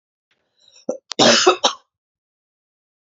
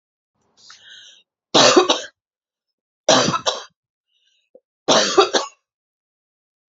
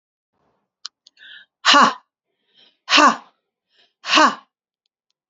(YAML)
cough_length: 3.2 s
cough_amplitude: 31924
cough_signal_mean_std_ratio: 0.3
three_cough_length: 6.7 s
three_cough_amplitude: 31608
three_cough_signal_mean_std_ratio: 0.34
exhalation_length: 5.3 s
exhalation_amplitude: 31120
exhalation_signal_mean_std_ratio: 0.31
survey_phase: beta (2021-08-13 to 2022-03-07)
age: 45-64
gender: Female
wearing_mask: 'No'
symptom_cough_any: true
symptom_runny_or_blocked_nose: true
symptom_sore_throat: true
smoker_status: Never smoked
respiratory_condition_asthma: true
respiratory_condition_other: false
recruitment_source: Test and Trace
submission_delay: 1 day
covid_test_result: Positive
covid_test_method: RT-qPCR
covid_ct_value: 22.5
covid_ct_gene: N gene